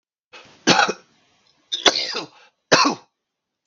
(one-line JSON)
{"three_cough_length": "3.7 s", "three_cough_amplitude": 32768, "three_cough_signal_mean_std_ratio": 0.35, "survey_phase": "beta (2021-08-13 to 2022-03-07)", "age": "45-64", "gender": "Male", "wearing_mask": "No", "symptom_cough_any": true, "symptom_runny_or_blocked_nose": true, "symptom_sore_throat": true, "symptom_onset": "3 days", "smoker_status": "Ex-smoker", "respiratory_condition_asthma": false, "respiratory_condition_other": false, "recruitment_source": "Test and Trace", "submission_delay": "1 day", "covid_test_result": "Positive", "covid_test_method": "ePCR"}